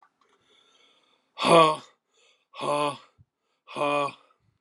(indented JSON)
{
  "exhalation_length": "4.6 s",
  "exhalation_amplitude": 18696,
  "exhalation_signal_mean_std_ratio": 0.34,
  "survey_phase": "alpha (2021-03-01 to 2021-08-12)",
  "age": "45-64",
  "gender": "Male",
  "wearing_mask": "No",
  "symptom_cough_any": true,
  "symptom_fatigue": true,
  "symptom_headache": true,
  "symptom_onset": "64 days",
  "smoker_status": "Never smoked",
  "respiratory_condition_asthma": false,
  "respiratory_condition_other": false,
  "recruitment_source": "Test and Trace",
  "submission_delay": "2 days",
  "covid_test_result": "Positive",
  "covid_test_method": "ePCR"
}